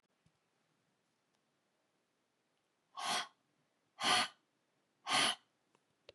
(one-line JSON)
{"exhalation_length": "6.1 s", "exhalation_amplitude": 3823, "exhalation_signal_mean_std_ratio": 0.29, "survey_phase": "beta (2021-08-13 to 2022-03-07)", "age": "45-64", "gender": "Female", "wearing_mask": "No", "symptom_headache": true, "smoker_status": "Never smoked", "respiratory_condition_asthma": false, "respiratory_condition_other": false, "recruitment_source": "Test and Trace", "submission_delay": "1 day", "covid_test_result": "Positive", "covid_test_method": "RT-qPCR"}